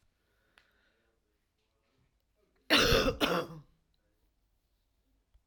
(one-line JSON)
{"cough_length": "5.5 s", "cough_amplitude": 9092, "cough_signal_mean_std_ratio": 0.29, "survey_phase": "alpha (2021-03-01 to 2021-08-12)", "age": "65+", "gender": "Female", "wearing_mask": "No", "symptom_none": true, "smoker_status": "Never smoked", "respiratory_condition_asthma": false, "respiratory_condition_other": false, "recruitment_source": "REACT", "submission_delay": "3 days", "covid_test_result": "Negative", "covid_test_method": "RT-qPCR"}